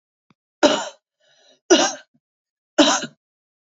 {"three_cough_length": "3.8 s", "three_cough_amplitude": 29370, "three_cough_signal_mean_std_ratio": 0.32, "survey_phase": "beta (2021-08-13 to 2022-03-07)", "age": "45-64", "gender": "Female", "wearing_mask": "No", "symptom_cough_any": true, "symptom_runny_or_blocked_nose": true, "symptom_shortness_of_breath": true, "symptom_sore_throat": true, "symptom_fatigue": true, "smoker_status": "Never smoked", "respiratory_condition_asthma": true, "respiratory_condition_other": false, "recruitment_source": "Test and Trace", "submission_delay": "1 day", "covid_test_result": "Positive", "covid_test_method": "LFT"}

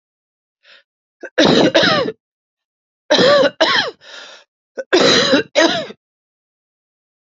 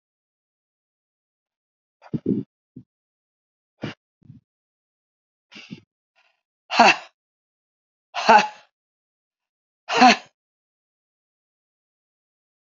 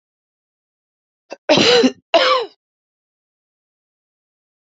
{"three_cough_length": "7.3 s", "three_cough_amplitude": 32768, "three_cough_signal_mean_std_ratio": 0.47, "exhalation_length": "12.8 s", "exhalation_amplitude": 32767, "exhalation_signal_mean_std_ratio": 0.2, "cough_length": "4.8 s", "cough_amplitude": 32767, "cough_signal_mean_std_ratio": 0.32, "survey_phase": "beta (2021-08-13 to 2022-03-07)", "age": "45-64", "gender": "Female", "wearing_mask": "No", "symptom_cough_any": true, "symptom_new_continuous_cough": true, "symptom_runny_or_blocked_nose": true, "symptom_shortness_of_breath": true, "symptom_sore_throat": true, "symptom_fatigue": true, "symptom_headache": true, "symptom_change_to_sense_of_smell_or_taste": true, "symptom_loss_of_taste": true, "symptom_onset": "5 days", "smoker_status": "Never smoked", "respiratory_condition_asthma": false, "respiratory_condition_other": false, "recruitment_source": "Test and Trace", "submission_delay": "2 days", "covid_test_result": "Positive", "covid_test_method": "ePCR"}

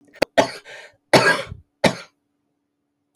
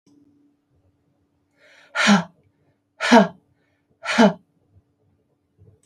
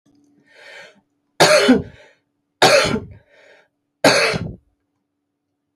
{"cough_length": "3.2 s", "cough_amplitude": 29729, "cough_signal_mean_std_ratio": 0.31, "exhalation_length": "5.9 s", "exhalation_amplitude": 27700, "exhalation_signal_mean_std_ratio": 0.28, "three_cough_length": "5.8 s", "three_cough_amplitude": 30869, "three_cough_signal_mean_std_ratio": 0.37, "survey_phase": "alpha (2021-03-01 to 2021-08-12)", "age": "65+", "gender": "Female", "wearing_mask": "No", "symptom_none": true, "smoker_status": "Never smoked", "respiratory_condition_asthma": false, "respiratory_condition_other": false, "recruitment_source": "REACT", "submission_delay": "3 days", "covid_test_result": "Negative", "covid_test_method": "RT-qPCR"}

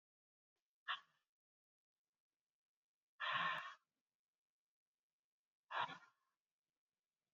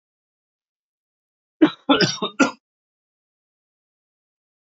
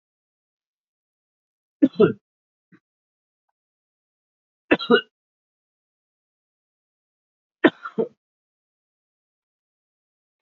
{"exhalation_length": "7.3 s", "exhalation_amplitude": 1075, "exhalation_signal_mean_std_ratio": 0.26, "cough_length": "4.8 s", "cough_amplitude": 26532, "cough_signal_mean_std_ratio": 0.23, "three_cough_length": "10.4 s", "three_cough_amplitude": 26396, "three_cough_signal_mean_std_ratio": 0.16, "survey_phase": "beta (2021-08-13 to 2022-03-07)", "age": "45-64", "gender": "Male", "wearing_mask": "No", "symptom_cough_any": true, "symptom_runny_or_blocked_nose": true, "symptom_sore_throat": true, "symptom_fatigue": true, "symptom_fever_high_temperature": true, "symptom_onset": "5 days", "smoker_status": "Never smoked", "respiratory_condition_asthma": false, "respiratory_condition_other": false, "recruitment_source": "Test and Trace", "submission_delay": "2 days", "covid_test_result": "Positive", "covid_test_method": "RT-qPCR", "covid_ct_value": 19.0, "covid_ct_gene": "ORF1ab gene", "covid_ct_mean": 19.0, "covid_viral_load": "580000 copies/ml", "covid_viral_load_category": "Low viral load (10K-1M copies/ml)"}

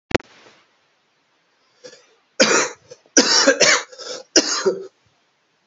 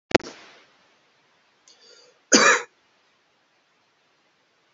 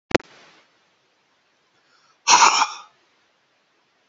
{"three_cough_length": "5.7 s", "three_cough_amplitude": 32722, "three_cough_signal_mean_std_ratio": 0.39, "cough_length": "4.7 s", "cough_amplitude": 31187, "cough_signal_mean_std_ratio": 0.21, "exhalation_length": "4.1 s", "exhalation_amplitude": 30513, "exhalation_signal_mean_std_ratio": 0.25, "survey_phase": "beta (2021-08-13 to 2022-03-07)", "age": "45-64", "gender": "Male", "wearing_mask": "No", "symptom_cough_any": true, "symptom_runny_or_blocked_nose": true, "symptom_fatigue": true, "symptom_headache": true, "symptom_change_to_sense_of_smell_or_taste": true, "symptom_loss_of_taste": true, "symptom_onset": "5 days", "smoker_status": "Never smoked", "respiratory_condition_asthma": true, "respiratory_condition_other": false, "recruitment_source": "Test and Trace", "submission_delay": "2 days", "covid_test_result": "Positive", "covid_test_method": "RT-qPCR"}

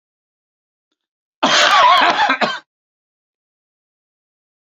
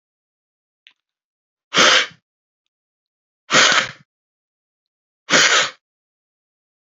{"cough_length": "4.7 s", "cough_amplitude": 32767, "cough_signal_mean_std_ratio": 0.39, "exhalation_length": "6.8 s", "exhalation_amplitude": 32768, "exhalation_signal_mean_std_ratio": 0.31, "survey_phase": "beta (2021-08-13 to 2022-03-07)", "age": "65+", "gender": "Male", "wearing_mask": "No", "symptom_cough_any": true, "symptom_headache": true, "symptom_onset": "9 days", "smoker_status": "Never smoked", "respiratory_condition_asthma": false, "respiratory_condition_other": false, "recruitment_source": "REACT", "submission_delay": "1 day", "covid_test_result": "Positive", "covid_test_method": "RT-qPCR", "covid_ct_value": 22.0, "covid_ct_gene": "E gene", "influenza_a_test_result": "Negative", "influenza_b_test_result": "Negative"}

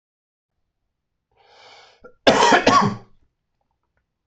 {"cough_length": "4.3 s", "cough_amplitude": 24888, "cough_signal_mean_std_ratio": 0.32, "survey_phase": "alpha (2021-03-01 to 2021-08-12)", "age": "18-44", "gender": "Male", "wearing_mask": "No", "symptom_none": true, "smoker_status": "Ex-smoker", "respiratory_condition_asthma": false, "respiratory_condition_other": false, "recruitment_source": "REACT", "submission_delay": "1 day", "covid_test_result": "Negative", "covid_test_method": "RT-qPCR"}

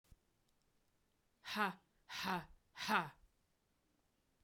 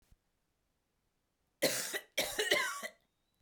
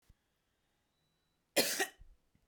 {"exhalation_length": "4.4 s", "exhalation_amplitude": 3135, "exhalation_signal_mean_std_ratio": 0.34, "three_cough_length": "3.4 s", "three_cough_amplitude": 6063, "three_cough_signal_mean_std_ratio": 0.41, "cough_length": "2.5 s", "cough_amplitude": 5109, "cough_signal_mean_std_ratio": 0.27, "survey_phase": "beta (2021-08-13 to 2022-03-07)", "age": "18-44", "gender": "Female", "wearing_mask": "No", "symptom_cough_any": true, "symptom_runny_or_blocked_nose": true, "symptom_sore_throat": true, "symptom_headache": true, "smoker_status": "Never smoked", "respiratory_condition_asthma": true, "respiratory_condition_other": false, "recruitment_source": "Test and Trace", "submission_delay": "1 day", "covid_test_result": "Positive", "covid_test_method": "RT-qPCR", "covid_ct_value": 28.0, "covid_ct_gene": "N gene"}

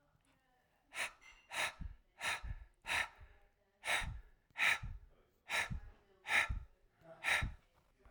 {"exhalation_length": "8.1 s", "exhalation_amplitude": 3388, "exhalation_signal_mean_std_ratio": 0.46, "survey_phase": "alpha (2021-03-01 to 2021-08-12)", "age": "45-64", "gender": "Male", "wearing_mask": "No", "symptom_none": true, "smoker_status": "Ex-smoker", "respiratory_condition_asthma": false, "respiratory_condition_other": false, "recruitment_source": "REACT", "submission_delay": "1 day", "covid_test_result": "Negative", "covid_test_method": "RT-qPCR"}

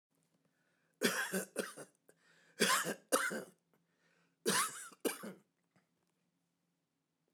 {"three_cough_length": "7.3 s", "three_cough_amplitude": 5238, "three_cough_signal_mean_std_ratio": 0.37, "survey_phase": "beta (2021-08-13 to 2022-03-07)", "age": "45-64", "gender": "Male", "wearing_mask": "No", "symptom_none": true, "smoker_status": "Ex-smoker", "respiratory_condition_asthma": false, "respiratory_condition_other": false, "recruitment_source": "REACT", "submission_delay": "3 days", "covid_test_result": "Negative", "covid_test_method": "RT-qPCR"}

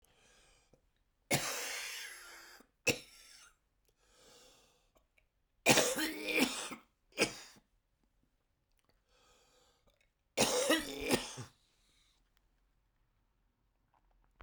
{"three_cough_length": "14.4 s", "three_cough_amplitude": 10291, "three_cough_signal_mean_std_ratio": 0.33, "survey_phase": "beta (2021-08-13 to 2022-03-07)", "age": "65+", "gender": "Male", "wearing_mask": "No", "symptom_cough_any": true, "symptom_runny_or_blocked_nose": true, "symptom_diarrhoea": true, "symptom_headache": true, "symptom_onset": "5 days", "smoker_status": "Ex-smoker", "respiratory_condition_asthma": false, "respiratory_condition_other": false, "recruitment_source": "Test and Trace", "submission_delay": "1 day", "covid_test_result": "Positive", "covid_test_method": "RT-qPCR", "covid_ct_value": 17.4, "covid_ct_gene": "S gene", "covid_ct_mean": 18.1, "covid_viral_load": "1200000 copies/ml", "covid_viral_load_category": "High viral load (>1M copies/ml)"}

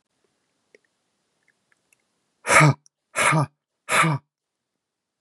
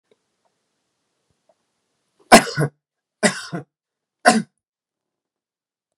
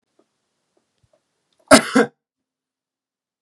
{"exhalation_length": "5.2 s", "exhalation_amplitude": 27667, "exhalation_signal_mean_std_ratio": 0.32, "three_cough_length": "6.0 s", "three_cough_amplitude": 32768, "three_cough_signal_mean_std_ratio": 0.21, "cough_length": "3.4 s", "cough_amplitude": 32768, "cough_signal_mean_std_ratio": 0.19, "survey_phase": "beta (2021-08-13 to 2022-03-07)", "age": "18-44", "gender": "Male", "wearing_mask": "No", "symptom_none": true, "smoker_status": "Ex-smoker", "respiratory_condition_asthma": false, "respiratory_condition_other": false, "recruitment_source": "Test and Trace", "submission_delay": "3 days", "covid_test_result": "Positive", "covid_test_method": "ePCR"}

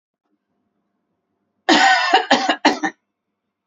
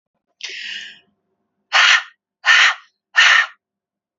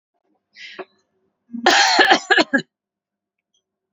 {"three_cough_length": "3.7 s", "three_cough_amplitude": 29913, "three_cough_signal_mean_std_ratio": 0.41, "exhalation_length": "4.2 s", "exhalation_amplitude": 31333, "exhalation_signal_mean_std_ratio": 0.4, "cough_length": "3.9 s", "cough_amplitude": 30306, "cough_signal_mean_std_ratio": 0.37, "survey_phase": "beta (2021-08-13 to 2022-03-07)", "age": "45-64", "gender": "Female", "wearing_mask": "No", "symptom_none": true, "smoker_status": "Never smoked", "respiratory_condition_asthma": false, "respiratory_condition_other": false, "recruitment_source": "REACT", "submission_delay": "3 days", "covid_test_result": "Negative", "covid_test_method": "RT-qPCR"}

